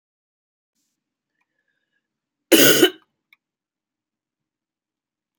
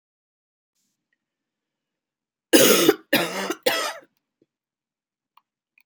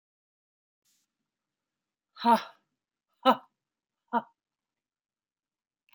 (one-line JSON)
{"cough_length": "5.4 s", "cough_amplitude": 32768, "cough_signal_mean_std_ratio": 0.2, "three_cough_length": "5.9 s", "three_cough_amplitude": 29665, "three_cough_signal_mean_std_ratio": 0.29, "exhalation_length": "5.9 s", "exhalation_amplitude": 11945, "exhalation_signal_mean_std_ratio": 0.19, "survey_phase": "alpha (2021-03-01 to 2021-08-12)", "age": "45-64", "gender": "Female", "wearing_mask": "No", "symptom_cough_any": true, "symptom_new_continuous_cough": true, "symptom_shortness_of_breath": true, "symptom_fatigue": true, "symptom_headache": true, "smoker_status": "Ex-smoker", "respiratory_condition_asthma": false, "respiratory_condition_other": false, "recruitment_source": "Test and Trace", "submission_delay": "2 days", "covid_test_result": "Positive", "covid_test_method": "RT-qPCR"}